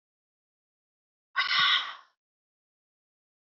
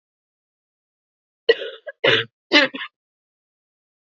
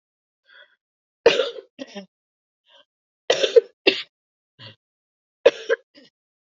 {"exhalation_length": "3.4 s", "exhalation_amplitude": 8229, "exhalation_signal_mean_std_ratio": 0.31, "cough_length": "4.1 s", "cough_amplitude": 27882, "cough_signal_mean_std_ratio": 0.27, "three_cough_length": "6.6 s", "three_cough_amplitude": 28046, "three_cough_signal_mean_std_ratio": 0.23, "survey_phase": "beta (2021-08-13 to 2022-03-07)", "age": "18-44", "gender": "Female", "wearing_mask": "No", "symptom_cough_any": true, "symptom_new_continuous_cough": true, "symptom_runny_or_blocked_nose": true, "symptom_fatigue": true, "symptom_headache": true, "symptom_onset": "4 days", "smoker_status": "Never smoked", "respiratory_condition_asthma": false, "respiratory_condition_other": false, "recruitment_source": "Test and Trace", "submission_delay": "2 days", "covid_test_result": "Positive", "covid_test_method": "RT-qPCR"}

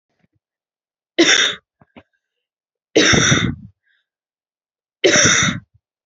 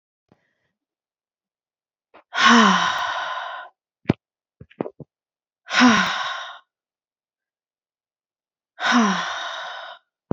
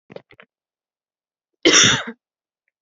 {"three_cough_length": "6.1 s", "three_cough_amplitude": 31301, "three_cough_signal_mean_std_ratio": 0.4, "exhalation_length": "10.3 s", "exhalation_amplitude": 26436, "exhalation_signal_mean_std_ratio": 0.37, "cough_length": "2.8 s", "cough_amplitude": 30693, "cough_signal_mean_std_ratio": 0.29, "survey_phase": "beta (2021-08-13 to 2022-03-07)", "age": "18-44", "gender": "Female", "wearing_mask": "No", "symptom_runny_or_blocked_nose": true, "symptom_shortness_of_breath": true, "symptom_abdominal_pain": true, "symptom_fatigue": true, "symptom_other": true, "smoker_status": "Never smoked", "respiratory_condition_asthma": true, "respiratory_condition_other": false, "recruitment_source": "Test and Trace", "submission_delay": "2 days", "covid_test_result": "Positive", "covid_test_method": "RT-qPCR", "covid_ct_value": 21.7, "covid_ct_gene": "ORF1ab gene", "covid_ct_mean": 22.2, "covid_viral_load": "51000 copies/ml", "covid_viral_load_category": "Low viral load (10K-1M copies/ml)"}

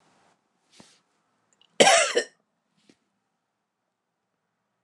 {"cough_length": "4.8 s", "cough_amplitude": 25839, "cough_signal_mean_std_ratio": 0.22, "survey_phase": "alpha (2021-03-01 to 2021-08-12)", "age": "65+", "gender": "Female", "wearing_mask": "No", "symptom_none": true, "smoker_status": "Never smoked", "respiratory_condition_asthma": true, "respiratory_condition_other": false, "recruitment_source": "REACT", "submission_delay": "2 days", "covid_test_result": "Negative", "covid_test_method": "RT-qPCR"}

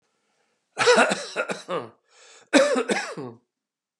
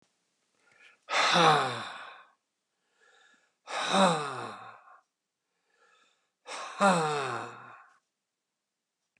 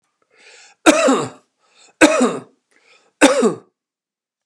{"cough_length": "4.0 s", "cough_amplitude": 23910, "cough_signal_mean_std_ratio": 0.44, "exhalation_length": "9.2 s", "exhalation_amplitude": 11860, "exhalation_signal_mean_std_ratio": 0.38, "three_cough_length": "4.5 s", "three_cough_amplitude": 32768, "three_cough_signal_mean_std_ratio": 0.38, "survey_phase": "beta (2021-08-13 to 2022-03-07)", "age": "65+", "gender": "Male", "wearing_mask": "No", "symptom_abdominal_pain": true, "symptom_fatigue": true, "smoker_status": "Ex-smoker", "respiratory_condition_asthma": false, "respiratory_condition_other": false, "recruitment_source": "REACT", "submission_delay": "3 days", "covid_test_result": "Negative", "covid_test_method": "RT-qPCR", "influenza_a_test_result": "Negative", "influenza_b_test_result": "Negative"}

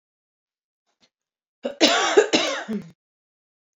{"cough_length": "3.8 s", "cough_amplitude": 29381, "cough_signal_mean_std_ratio": 0.36, "survey_phase": "beta (2021-08-13 to 2022-03-07)", "age": "18-44", "gender": "Female", "wearing_mask": "No", "symptom_none": true, "symptom_onset": "12 days", "smoker_status": "Never smoked", "respiratory_condition_asthma": true, "respiratory_condition_other": false, "recruitment_source": "REACT", "submission_delay": "1 day", "covid_test_result": "Negative", "covid_test_method": "RT-qPCR"}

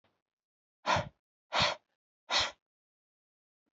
{"exhalation_length": "3.8 s", "exhalation_amplitude": 5821, "exhalation_signal_mean_std_ratio": 0.31, "survey_phase": "beta (2021-08-13 to 2022-03-07)", "age": "18-44", "gender": "Male", "wearing_mask": "No", "symptom_none": true, "smoker_status": "Never smoked", "respiratory_condition_asthma": false, "respiratory_condition_other": false, "recruitment_source": "REACT", "submission_delay": "2 days", "covid_test_result": "Negative", "covid_test_method": "RT-qPCR", "influenza_a_test_result": "Unknown/Void", "influenza_b_test_result": "Unknown/Void"}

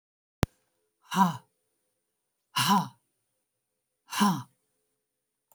{"exhalation_length": "5.5 s", "exhalation_amplitude": 14751, "exhalation_signal_mean_std_ratio": 0.29, "survey_phase": "alpha (2021-03-01 to 2021-08-12)", "age": "65+", "gender": "Female", "wearing_mask": "No", "symptom_none": true, "smoker_status": "Ex-smoker", "respiratory_condition_asthma": false, "respiratory_condition_other": false, "recruitment_source": "REACT", "submission_delay": "2 days", "covid_test_result": "Negative", "covid_test_method": "RT-qPCR"}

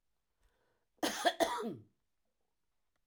{"cough_length": "3.1 s", "cough_amplitude": 4926, "cough_signal_mean_std_ratio": 0.33, "survey_phase": "alpha (2021-03-01 to 2021-08-12)", "age": "65+", "gender": "Female", "wearing_mask": "No", "symptom_none": true, "smoker_status": "Ex-smoker", "respiratory_condition_asthma": false, "respiratory_condition_other": false, "recruitment_source": "REACT", "submission_delay": "2 days", "covid_test_result": "Negative", "covid_test_method": "RT-qPCR"}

